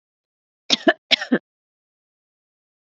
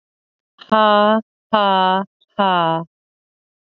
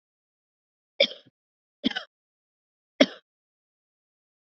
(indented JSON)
{
  "cough_length": "2.9 s",
  "cough_amplitude": 31912,
  "cough_signal_mean_std_ratio": 0.21,
  "exhalation_length": "3.8 s",
  "exhalation_amplitude": 31350,
  "exhalation_signal_mean_std_ratio": 0.46,
  "three_cough_length": "4.4 s",
  "three_cough_amplitude": 25779,
  "three_cough_signal_mean_std_ratio": 0.15,
  "survey_phase": "alpha (2021-03-01 to 2021-08-12)",
  "age": "45-64",
  "gender": "Female",
  "wearing_mask": "No",
  "symptom_cough_any": true,
  "symptom_fatigue": true,
  "symptom_fever_high_temperature": true,
  "symptom_headache": true,
  "smoker_status": "Never smoked",
  "respiratory_condition_asthma": false,
  "respiratory_condition_other": false,
  "recruitment_source": "Test and Trace",
  "submission_delay": "2 days",
  "covid_test_result": "Positive",
  "covid_test_method": "RT-qPCR"
}